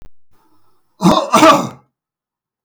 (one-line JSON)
{"cough_length": "2.6 s", "cough_amplitude": 32768, "cough_signal_mean_std_ratio": 0.39, "survey_phase": "beta (2021-08-13 to 2022-03-07)", "age": "65+", "gender": "Male", "wearing_mask": "No", "symptom_none": true, "smoker_status": "Ex-smoker", "respiratory_condition_asthma": false, "respiratory_condition_other": false, "recruitment_source": "REACT", "submission_delay": "2 days", "covid_test_result": "Negative", "covid_test_method": "RT-qPCR", "influenza_a_test_result": "Negative", "influenza_b_test_result": "Negative"}